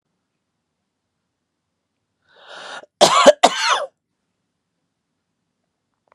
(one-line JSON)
{"cough_length": "6.1 s", "cough_amplitude": 32768, "cough_signal_mean_std_ratio": 0.24, "survey_phase": "beta (2021-08-13 to 2022-03-07)", "age": "65+", "gender": "Male", "wearing_mask": "No", "symptom_none": true, "smoker_status": "Never smoked", "respiratory_condition_asthma": false, "respiratory_condition_other": false, "recruitment_source": "REACT", "submission_delay": "2 days", "covid_test_result": "Negative", "covid_test_method": "RT-qPCR"}